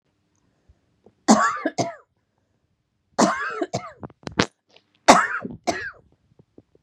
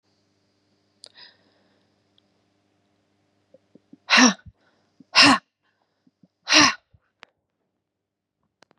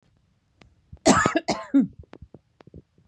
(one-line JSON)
{"three_cough_length": "6.8 s", "three_cough_amplitude": 32768, "three_cough_signal_mean_std_ratio": 0.32, "exhalation_length": "8.8 s", "exhalation_amplitude": 30172, "exhalation_signal_mean_std_ratio": 0.22, "cough_length": "3.1 s", "cough_amplitude": 25822, "cough_signal_mean_std_ratio": 0.34, "survey_phase": "beta (2021-08-13 to 2022-03-07)", "age": "45-64", "gender": "Female", "wearing_mask": "No", "symptom_none": true, "smoker_status": "Never smoked", "respiratory_condition_asthma": false, "respiratory_condition_other": false, "recruitment_source": "REACT", "submission_delay": "2 days", "covid_test_result": "Negative", "covid_test_method": "RT-qPCR", "influenza_a_test_result": "Negative", "influenza_b_test_result": "Negative"}